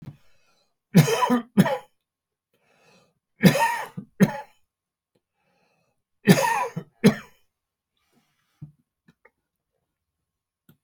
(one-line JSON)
{"three_cough_length": "10.8 s", "three_cough_amplitude": 27326, "three_cough_signal_mean_std_ratio": 0.28, "survey_phase": "beta (2021-08-13 to 2022-03-07)", "age": "65+", "gender": "Male", "wearing_mask": "No", "symptom_none": true, "smoker_status": "Ex-smoker", "respiratory_condition_asthma": false, "respiratory_condition_other": false, "recruitment_source": "REACT", "submission_delay": "1 day", "covid_test_result": "Negative", "covid_test_method": "RT-qPCR"}